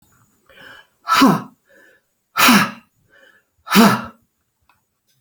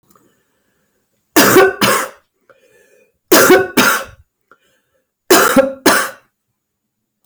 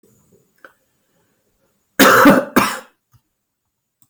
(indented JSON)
{
  "exhalation_length": "5.2 s",
  "exhalation_amplitude": 32767,
  "exhalation_signal_mean_std_ratio": 0.35,
  "three_cough_length": "7.3 s",
  "three_cough_amplitude": 32768,
  "three_cough_signal_mean_std_ratio": 0.42,
  "cough_length": "4.1 s",
  "cough_amplitude": 32767,
  "cough_signal_mean_std_ratio": 0.32,
  "survey_phase": "beta (2021-08-13 to 2022-03-07)",
  "age": "45-64",
  "gender": "Female",
  "wearing_mask": "No",
  "symptom_none": true,
  "smoker_status": "Never smoked",
  "respiratory_condition_asthma": false,
  "respiratory_condition_other": true,
  "recruitment_source": "REACT",
  "submission_delay": "4 days",
  "covid_test_result": "Negative",
  "covid_test_method": "RT-qPCR",
  "influenza_a_test_result": "Negative",
  "influenza_b_test_result": "Negative"
}